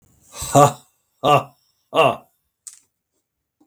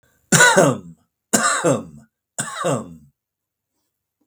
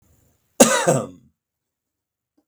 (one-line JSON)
{"exhalation_length": "3.7 s", "exhalation_amplitude": 32766, "exhalation_signal_mean_std_ratio": 0.31, "three_cough_length": "4.3 s", "three_cough_amplitude": 32766, "three_cough_signal_mean_std_ratio": 0.42, "cough_length": "2.5 s", "cough_amplitude": 32768, "cough_signal_mean_std_ratio": 0.29, "survey_phase": "beta (2021-08-13 to 2022-03-07)", "age": "65+", "gender": "Male", "wearing_mask": "No", "symptom_none": true, "smoker_status": "Never smoked", "respiratory_condition_asthma": false, "respiratory_condition_other": false, "recruitment_source": "REACT", "submission_delay": "3 days", "covid_test_result": "Negative", "covid_test_method": "RT-qPCR", "influenza_a_test_result": "Negative", "influenza_b_test_result": "Negative"}